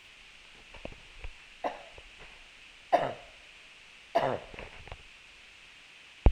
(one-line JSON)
{"three_cough_length": "6.3 s", "three_cough_amplitude": 18748, "three_cough_signal_mean_std_ratio": 0.3, "survey_phase": "alpha (2021-03-01 to 2021-08-12)", "age": "45-64", "gender": "Female", "wearing_mask": "No", "symptom_none": true, "smoker_status": "Never smoked", "respiratory_condition_asthma": false, "respiratory_condition_other": false, "recruitment_source": "REACT", "submission_delay": "2 days", "covid_test_result": "Negative", "covid_test_method": "RT-qPCR"}